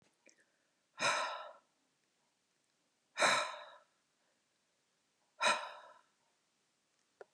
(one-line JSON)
{"exhalation_length": "7.3 s", "exhalation_amplitude": 5114, "exhalation_signal_mean_std_ratio": 0.3, "survey_phase": "beta (2021-08-13 to 2022-03-07)", "age": "65+", "gender": "Female", "wearing_mask": "No", "symptom_none": true, "smoker_status": "Ex-smoker", "respiratory_condition_asthma": false, "respiratory_condition_other": false, "recruitment_source": "REACT", "submission_delay": "5 days", "covid_test_result": "Negative", "covid_test_method": "RT-qPCR", "influenza_a_test_result": "Negative", "influenza_b_test_result": "Negative"}